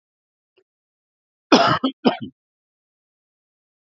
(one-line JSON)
{"cough_length": "3.8 s", "cough_amplitude": 29721, "cough_signal_mean_std_ratio": 0.25, "survey_phase": "alpha (2021-03-01 to 2021-08-12)", "age": "45-64", "gender": "Male", "wearing_mask": "No", "symptom_fatigue": true, "symptom_onset": "4 days", "smoker_status": "Ex-smoker", "respiratory_condition_asthma": false, "respiratory_condition_other": false, "recruitment_source": "Test and Trace", "submission_delay": "2 days", "covid_test_result": "Positive", "covid_test_method": "RT-qPCR"}